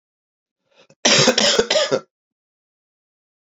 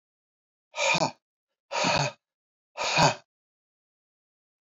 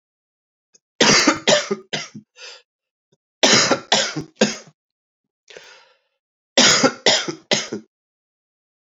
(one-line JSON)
{"cough_length": "3.4 s", "cough_amplitude": 31504, "cough_signal_mean_std_ratio": 0.39, "exhalation_length": "4.6 s", "exhalation_amplitude": 12680, "exhalation_signal_mean_std_ratio": 0.37, "three_cough_length": "8.9 s", "three_cough_amplitude": 32768, "three_cough_signal_mean_std_ratio": 0.39, "survey_phase": "beta (2021-08-13 to 2022-03-07)", "age": "45-64", "gender": "Male", "wearing_mask": "No", "symptom_cough_any": true, "symptom_runny_or_blocked_nose": true, "symptom_sore_throat": true, "symptom_fatigue": true, "symptom_headache": true, "symptom_change_to_sense_of_smell_or_taste": true, "symptom_onset": "4 days", "smoker_status": "Never smoked", "respiratory_condition_asthma": false, "respiratory_condition_other": false, "recruitment_source": "Test and Trace", "submission_delay": "2 days", "covid_test_result": "Positive", "covid_test_method": "RT-qPCR", "covid_ct_value": 16.8, "covid_ct_gene": "ORF1ab gene", "covid_ct_mean": 17.8, "covid_viral_load": "1500000 copies/ml", "covid_viral_load_category": "High viral load (>1M copies/ml)"}